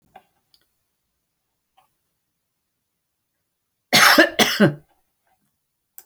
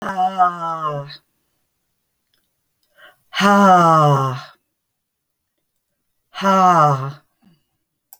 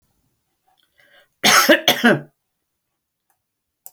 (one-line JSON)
{"three_cough_length": "6.1 s", "three_cough_amplitude": 31593, "three_cough_signal_mean_std_ratio": 0.25, "exhalation_length": "8.2 s", "exhalation_amplitude": 28333, "exhalation_signal_mean_std_ratio": 0.45, "cough_length": "3.9 s", "cough_amplitude": 30351, "cough_signal_mean_std_ratio": 0.31, "survey_phase": "alpha (2021-03-01 to 2021-08-12)", "age": "65+", "gender": "Female", "wearing_mask": "No", "symptom_none": true, "smoker_status": "Ex-smoker", "respiratory_condition_asthma": false, "respiratory_condition_other": false, "recruitment_source": "REACT", "submission_delay": "3 days", "covid_test_result": "Negative", "covid_test_method": "RT-qPCR"}